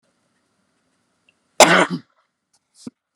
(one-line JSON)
{"cough_length": "3.2 s", "cough_amplitude": 32768, "cough_signal_mean_std_ratio": 0.23, "survey_phase": "beta (2021-08-13 to 2022-03-07)", "age": "45-64", "gender": "Female", "wearing_mask": "No", "symptom_none": true, "smoker_status": "Never smoked", "respiratory_condition_asthma": false, "respiratory_condition_other": false, "recruitment_source": "REACT", "submission_delay": "18 days", "covid_test_result": "Negative", "covid_test_method": "RT-qPCR"}